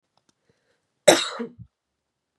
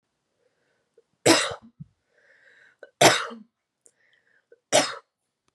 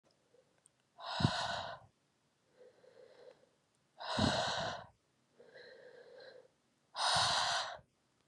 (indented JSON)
{
  "cough_length": "2.4 s",
  "cough_amplitude": 31955,
  "cough_signal_mean_std_ratio": 0.22,
  "three_cough_length": "5.5 s",
  "three_cough_amplitude": 28928,
  "three_cough_signal_mean_std_ratio": 0.26,
  "exhalation_length": "8.3 s",
  "exhalation_amplitude": 5135,
  "exhalation_signal_mean_std_ratio": 0.44,
  "survey_phase": "beta (2021-08-13 to 2022-03-07)",
  "age": "18-44",
  "gender": "Female",
  "wearing_mask": "No",
  "symptom_cough_any": true,
  "symptom_runny_or_blocked_nose": true,
  "symptom_sore_throat": true,
  "symptom_fatigue": true,
  "symptom_headache": true,
  "symptom_other": true,
  "symptom_onset": "4 days",
  "smoker_status": "Ex-smoker",
  "respiratory_condition_asthma": false,
  "respiratory_condition_other": false,
  "recruitment_source": "Test and Trace",
  "submission_delay": "2 days",
  "covid_test_result": "Positive",
  "covid_test_method": "RT-qPCR",
  "covid_ct_value": 23.0,
  "covid_ct_gene": "N gene",
  "covid_ct_mean": 23.1,
  "covid_viral_load": "26000 copies/ml",
  "covid_viral_load_category": "Low viral load (10K-1M copies/ml)"
}